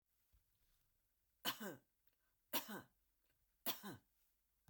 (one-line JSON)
{"three_cough_length": "4.7 s", "three_cough_amplitude": 1577, "three_cough_signal_mean_std_ratio": 0.29, "survey_phase": "beta (2021-08-13 to 2022-03-07)", "age": "65+", "gender": "Female", "wearing_mask": "No", "symptom_none": true, "smoker_status": "Never smoked", "respiratory_condition_asthma": false, "respiratory_condition_other": false, "recruitment_source": "REACT", "submission_delay": "8 days", "covid_test_result": "Negative", "covid_test_method": "RT-qPCR"}